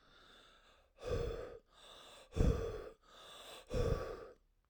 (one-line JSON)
{"exhalation_length": "4.7 s", "exhalation_amplitude": 4132, "exhalation_signal_mean_std_ratio": 0.47, "survey_phase": "alpha (2021-03-01 to 2021-08-12)", "age": "18-44", "gender": "Male", "wearing_mask": "No", "symptom_diarrhoea": true, "smoker_status": "Never smoked", "respiratory_condition_asthma": true, "respiratory_condition_other": false, "recruitment_source": "REACT", "submission_delay": "1 day", "covid_test_result": "Negative", "covid_test_method": "RT-qPCR"}